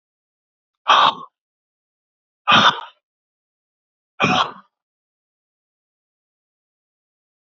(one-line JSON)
{"exhalation_length": "7.6 s", "exhalation_amplitude": 29215, "exhalation_signal_mean_std_ratio": 0.26, "survey_phase": "beta (2021-08-13 to 2022-03-07)", "age": "45-64", "gender": "Male", "wearing_mask": "No", "symptom_cough_any": true, "symptom_runny_or_blocked_nose": true, "symptom_sore_throat": true, "symptom_fatigue": true, "symptom_fever_high_temperature": true, "symptom_headache": true, "symptom_onset": "6 days", "smoker_status": "Ex-smoker", "respiratory_condition_asthma": false, "respiratory_condition_other": false, "recruitment_source": "Test and Trace", "submission_delay": "2 days", "covid_test_result": "Positive", "covid_test_method": "ePCR"}